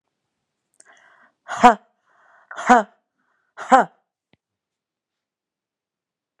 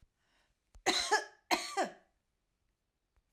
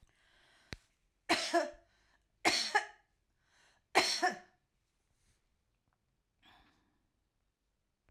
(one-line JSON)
{"exhalation_length": "6.4 s", "exhalation_amplitude": 32767, "exhalation_signal_mean_std_ratio": 0.2, "cough_length": "3.3 s", "cough_amplitude": 6119, "cough_signal_mean_std_ratio": 0.34, "three_cough_length": "8.1 s", "three_cough_amplitude": 7776, "three_cough_signal_mean_std_ratio": 0.28, "survey_phase": "alpha (2021-03-01 to 2021-08-12)", "age": "45-64", "gender": "Female", "wearing_mask": "No", "symptom_cough_any": true, "smoker_status": "Ex-smoker", "respiratory_condition_asthma": false, "respiratory_condition_other": false, "recruitment_source": "REACT", "submission_delay": "3 days", "covid_test_result": "Negative", "covid_test_method": "RT-qPCR"}